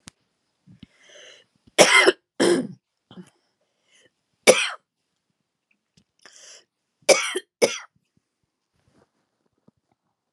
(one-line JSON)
{"three_cough_length": "10.3 s", "three_cough_amplitude": 32768, "three_cough_signal_mean_std_ratio": 0.25, "survey_phase": "alpha (2021-03-01 to 2021-08-12)", "age": "45-64", "gender": "Female", "wearing_mask": "No", "symptom_abdominal_pain": true, "symptom_fatigue": true, "symptom_headache": true, "symptom_change_to_sense_of_smell_or_taste": true, "symptom_onset": "8 days", "smoker_status": "Never smoked", "respiratory_condition_asthma": false, "respiratory_condition_other": false, "recruitment_source": "Test and Trace", "submission_delay": "2 days", "covid_test_result": "Positive", "covid_test_method": "RT-qPCR", "covid_ct_value": 25.3, "covid_ct_gene": "ORF1ab gene"}